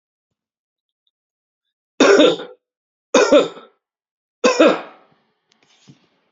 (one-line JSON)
{"three_cough_length": "6.3 s", "three_cough_amplitude": 29564, "three_cough_signal_mean_std_ratio": 0.32, "survey_phase": "beta (2021-08-13 to 2022-03-07)", "age": "45-64", "gender": "Male", "wearing_mask": "Yes", "symptom_none": true, "smoker_status": "Never smoked", "respiratory_condition_asthma": false, "respiratory_condition_other": false, "recruitment_source": "Test and Trace", "submission_delay": "1 day", "covid_test_result": "Positive", "covid_test_method": "RT-qPCR"}